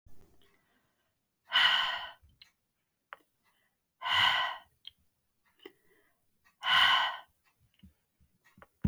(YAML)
exhalation_length: 8.9 s
exhalation_amplitude: 8122
exhalation_signal_mean_std_ratio: 0.34
survey_phase: beta (2021-08-13 to 2022-03-07)
age: 45-64
gender: Female
wearing_mask: 'No'
symptom_none: true
smoker_status: Never smoked
respiratory_condition_asthma: false
respiratory_condition_other: false
recruitment_source: REACT
submission_delay: 0 days
covid_test_result: Negative
covid_test_method: RT-qPCR